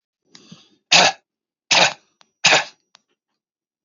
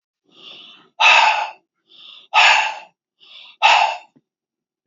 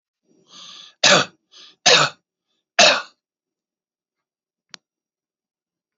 three_cough_length: 3.8 s
three_cough_amplitude: 29456
three_cough_signal_mean_std_ratio: 0.31
exhalation_length: 4.9 s
exhalation_amplitude: 32767
exhalation_signal_mean_std_ratio: 0.41
cough_length: 6.0 s
cough_amplitude: 32768
cough_signal_mean_std_ratio: 0.27
survey_phase: alpha (2021-03-01 to 2021-08-12)
age: 65+
gender: Male
wearing_mask: 'No'
symptom_none: true
smoker_status: Ex-smoker
respiratory_condition_asthma: false
respiratory_condition_other: true
recruitment_source: Test and Trace
submission_delay: 3 days
covid_test_result: Positive
covid_test_method: LFT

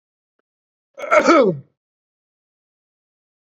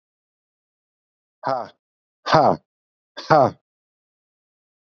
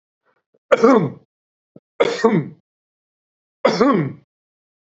cough_length: 3.5 s
cough_amplitude: 28561
cough_signal_mean_std_ratio: 0.29
exhalation_length: 4.9 s
exhalation_amplitude: 28117
exhalation_signal_mean_std_ratio: 0.26
three_cough_length: 4.9 s
three_cough_amplitude: 27713
three_cough_signal_mean_std_ratio: 0.38
survey_phase: beta (2021-08-13 to 2022-03-07)
age: 65+
gender: Male
wearing_mask: 'No'
symptom_none: true
symptom_onset: 9 days
smoker_status: Never smoked
respiratory_condition_asthma: false
respiratory_condition_other: false
recruitment_source: REACT
submission_delay: 3 days
covid_test_result: Negative
covid_test_method: RT-qPCR
influenza_a_test_result: Negative
influenza_b_test_result: Negative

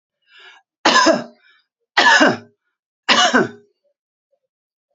three_cough_length: 4.9 s
three_cough_amplitude: 30027
three_cough_signal_mean_std_ratio: 0.39
survey_phase: beta (2021-08-13 to 2022-03-07)
age: 65+
gender: Female
wearing_mask: 'No'
symptom_cough_any: true
symptom_runny_or_blocked_nose: true
symptom_shortness_of_breath: true
symptom_fatigue: true
symptom_onset: 5 days
smoker_status: Ex-smoker
respiratory_condition_asthma: true
respiratory_condition_other: false
recruitment_source: REACT
submission_delay: 1 day
covid_test_result: Negative
covid_test_method: RT-qPCR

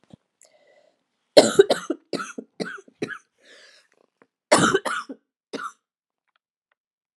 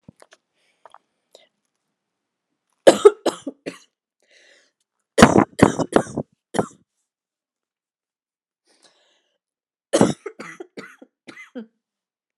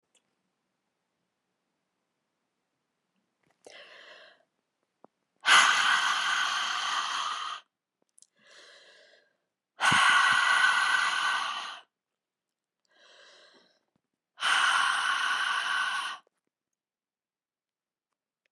cough_length: 7.2 s
cough_amplitude: 32768
cough_signal_mean_std_ratio: 0.25
three_cough_length: 12.4 s
three_cough_amplitude: 32768
three_cough_signal_mean_std_ratio: 0.2
exhalation_length: 18.5 s
exhalation_amplitude: 15621
exhalation_signal_mean_std_ratio: 0.45
survey_phase: alpha (2021-03-01 to 2021-08-12)
age: 45-64
gender: Female
wearing_mask: 'No'
symptom_cough_any: true
symptom_fatigue: true
symptom_fever_high_temperature: true
symptom_change_to_sense_of_smell_or_taste: true
symptom_loss_of_taste: true
smoker_status: Never smoked
respiratory_condition_asthma: false
respiratory_condition_other: false
recruitment_source: Test and Trace
submission_delay: 2 days
covid_test_result: Positive
covid_test_method: LFT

